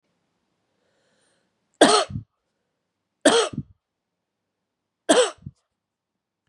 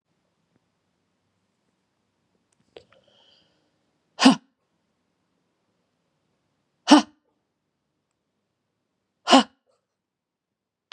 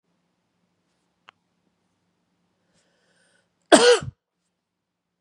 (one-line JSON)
{"three_cough_length": "6.5 s", "three_cough_amplitude": 32627, "three_cough_signal_mean_std_ratio": 0.26, "exhalation_length": "10.9 s", "exhalation_amplitude": 31130, "exhalation_signal_mean_std_ratio": 0.15, "cough_length": "5.2 s", "cough_amplitude": 32766, "cough_signal_mean_std_ratio": 0.18, "survey_phase": "beta (2021-08-13 to 2022-03-07)", "age": "45-64", "gender": "Female", "wearing_mask": "No", "symptom_cough_any": true, "symptom_runny_or_blocked_nose": true, "symptom_shortness_of_breath": true, "symptom_headache": true, "smoker_status": "Ex-smoker", "respiratory_condition_asthma": false, "respiratory_condition_other": false, "recruitment_source": "Test and Trace", "submission_delay": "3 days", "covid_test_result": "Positive", "covid_test_method": "RT-qPCR", "covid_ct_value": 29.1, "covid_ct_gene": "N gene", "covid_ct_mean": 29.2, "covid_viral_load": "270 copies/ml", "covid_viral_load_category": "Minimal viral load (< 10K copies/ml)"}